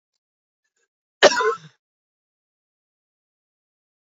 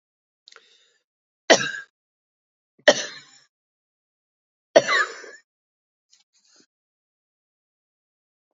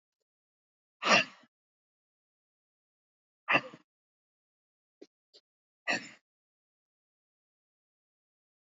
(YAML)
cough_length: 4.2 s
cough_amplitude: 28716
cough_signal_mean_std_ratio: 0.18
three_cough_length: 8.5 s
three_cough_amplitude: 32767
three_cough_signal_mean_std_ratio: 0.19
exhalation_length: 8.6 s
exhalation_amplitude: 9448
exhalation_signal_mean_std_ratio: 0.17
survey_phase: beta (2021-08-13 to 2022-03-07)
age: 45-64
gender: Female
wearing_mask: 'No'
symptom_shortness_of_breath: true
smoker_status: Never smoked
respiratory_condition_asthma: true
respiratory_condition_other: false
recruitment_source: REACT
submission_delay: 2 days
covid_test_result: Negative
covid_test_method: RT-qPCR
influenza_a_test_result: Negative
influenza_b_test_result: Negative